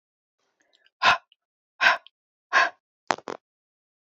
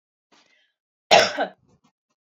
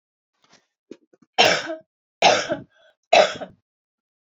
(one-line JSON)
{"exhalation_length": "4.0 s", "exhalation_amplitude": 28232, "exhalation_signal_mean_std_ratio": 0.27, "cough_length": "2.4 s", "cough_amplitude": 27760, "cough_signal_mean_std_ratio": 0.25, "three_cough_length": "4.4 s", "three_cough_amplitude": 30592, "three_cough_signal_mean_std_ratio": 0.32, "survey_phase": "beta (2021-08-13 to 2022-03-07)", "age": "18-44", "gender": "Female", "wearing_mask": "No", "symptom_none": true, "smoker_status": "Ex-smoker", "respiratory_condition_asthma": false, "respiratory_condition_other": false, "recruitment_source": "REACT", "submission_delay": "1 day", "covid_test_result": "Negative", "covid_test_method": "RT-qPCR"}